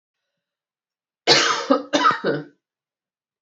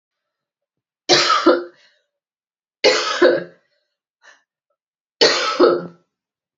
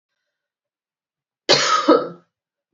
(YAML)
exhalation_length: 3.4 s
exhalation_amplitude: 31621
exhalation_signal_mean_std_ratio: 0.4
three_cough_length: 6.6 s
three_cough_amplitude: 29957
three_cough_signal_mean_std_ratio: 0.39
cough_length: 2.7 s
cough_amplitude: 30611
cough_signal_mean_std_ratio: 0.34
survey_phase: beta (2021-08-13 to 2022-03-07)
age: 45-64
gender: Female
wearing_mask: 'No'
symptom_runny_or_blocked_nose: true
symptom_abdominal_pain: true
symptom_fever_high_temperature: true
symptom_headache: true
symptom_change_to_sense_of_smell_or_taste: true
symptom_loss_of_taste: true
symptom_onset: 4 days
smoker_status: Ex-smoker
respiratory_condition_asthma: false
respiratory_condition_other: false
recruitment_source: Test and Trace
submission_delay: 3 days
covid_test_result: Positive
covid_test_method: RT-qPCR